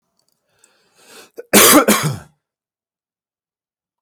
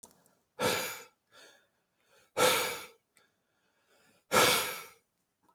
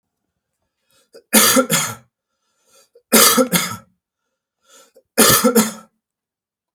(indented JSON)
{
  "cough_length": "4.0 s",
  "cough_amplitude": 32768,
  "cough_signal_mean_std_ratio": 0.3,
  "exhalation_length": "5.5 s",
  "exhalation_amplitude": 9421,
  "exhalation_signal_mean_std_ratio": 0.36,
  "three_cough_length": "6.7 s",
  "three_cough_amplitude": 32768,
  "three_cough_signal_mean_std_ratio": 0.38,
  "survey_phase": "beta (2021-08-13 to 2022-03-07)",
  "age": "45-64",
  "gender": "Male",
  "wearing_mask": "No",
  "symptom_none": true,
  "symptom_onset": "3 days",
  "smoker_status": "Ex-smoker",
  "respiratory_condition_asthma": false,
  "respiratory_condition_other": false,
  "recruitment_source": "REACT",
  "submission_delay": "6 days",
  "covid_test_result": "Negative",
  "covid_test_method": "RT-qPCR"
}